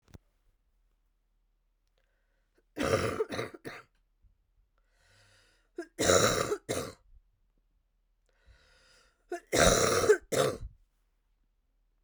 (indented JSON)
{
  "three_cough_length": "12.0 s",
  "three_cough_amplitude": 12699,
  "three_cough_signal_mean_std_ratio": 0.34,
  "survey_phase": "beta (2021-08-13 to 2022-03-07)",
  "age": "18-44",
  "gender": "Female",
  "wearing_mask": "No",
  "symptom_cough_any": true,
  "symptom_runny_or_blocked_nose": true,
  "symptom_shortness_of_breath": true,
  "symptom_onset": "6 days",
  "smoker_status": "Never smoked",
  "respiratory_condition_asthma": true,
  "respiratory_condition_other": false,
  "recruitment_source": "REACT",
  "submission_delay": "6 days",
  "covid_test_result": "Negative",
  "covid_test_method": "RT-qPCR",
  "influenza_a_test_result": "Negative",
  "influenza_b_test_result": "Negative"
}